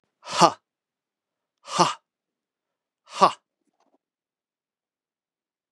{"exhalation_length": "5.7 s", "exhalation_amplitude": 31148, "exhalation_signal_mean_std_ratio": 0.19, "survey_phase": "beta (2021-08-13 to 2022-03-07)", "age": "65+", "gender": "Male", "wearing_mask": "No", "symptom_none": true, "smoker_status": "Ex-smoker", "respiratory_condition_asthma": false, "respiratory_condition_other": false, "recruitment_source": "REACT", "submission_delay": "2 days", "covid_test_result": "Negative", "covid_test_method": "RT-qPCR", "influenza_a_test_result": "Negative", "influenza_b_test_result": "Negative"}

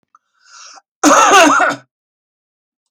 {"cough_length": "2.9 s", "cough_amplitude": 32768, "cough_signal_mean_std_ratio": 0.44, "survey_phase": "beta (2021-08-13 to 2022-03-07)", "age": "65+", "gender": "Male", "wearing_mask": "No", "symptom_sore_throat": true, "symptom_fatigue": true, "smoker_status": "Never smoked", "respiratory_condition_asthma": true, "respiratory_condition_other": false, "recruitment_source": "REACT", "submission_delay": "1 day", "covid_test_result": "Negative", "covid_test_method": "RT-qPCR"}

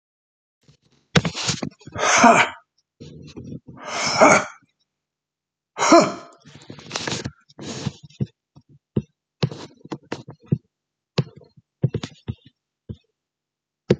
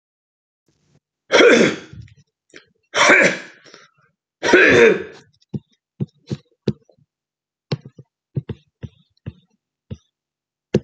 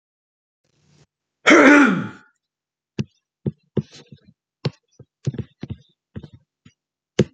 {"exhalation_length": "14.0 s", "exhalation_amplitude": 29856, "exhalation_signal_mean_std_ratio": 0.32, "three_cough_length": "10.8 s", "three_cough_amplitude": 32768, "three_cough_signal_mean_std_ratio": 0.32, "cough_length": "7.3 s", "cough_amplitude": 27963, "cough_signal_mean_std_ratio": 0.27, "survey_phase": "beta (2021-08-13 to 2022-03-07)", "age": "65+", "gender": "Male", "wearing_mask": "No", "symptom_none": true, "smoker_status": "Ex-smoker", "respiratory_condition_asthma": false, "respiratory_condition_other": false, "recruitment_source": "REACT", "submission_delay": "0 days", "covid_test_result": "Negative", "covid_test_method": "RT-qPCR"}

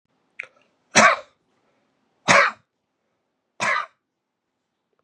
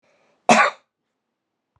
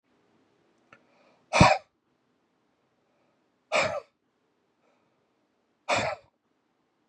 {"three_cough_length": "5.0 s", "three_cough_amplitude": 29496, "three_cough_signal_mean_std_ratio": 0.27, "cough_length": "1.8 s", "cough_amplitude": 30109, "cough_signal_mean_std_ratio": 0.27, "exhalation_length": "7.1 s", "exhalation_amplitude": 22319, "exhalation_signal_mean_std_ratio": 0.23, "survey_phase": "beta (2021-08-13 to 2022-03-07)", "age": "45-64", "gender": "Male", "wearing_mask": "No", "symptom_runny_or_blocked_nose": true, "symptom_sore_throat": true, "symptom_fever_high_temperature": true, "symptom_onset": "5 days", "smoker_status": "Never smoked", "respiratory_condition_asthma": true, "respiratory_condition_other": false, "recruitment_source": "Test and Trace", "submission_delay": "1 day", "covid_test_result": "Positive", "covid_test_method": "RT-qPCR", "covid_ct_value": 25.3, "covid_ct_gene": "ORF1ab gene"}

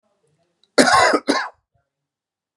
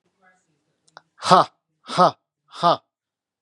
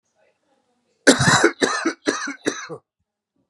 {"cough_length": "2.6 s", "cough_amplitude": 32525, "cough_signal_mean_std_ratio": 0.37, "exhalation_length": "3.4 s", "exhalation_amplitude": 32748, "exhalation_signal_mean_std_ratio": 0.28, "three_cough_length": "3.5 s", "three_cough_amplitude": 32767, "three_cough_signal_mean_std_ratio": 0.4, "survey_phase": "beta (2021-08-13 to 2022-03-07)", "age": "45-64", "gender": "Male", "wearing_mask": "No", "symptom_none": true, "smoker_status": "Ex-smoker", "respiratory_condition_asthma": false, "respiratory_condition_other": false, "recruitment_source": "REACT", "submission_delay": "2 days", "covid_test_result": "Negative", "covid_test_method": "RT-qPCR", "influenza_a_test_result": "Negative", "influenza_b_test_result": "Negative"}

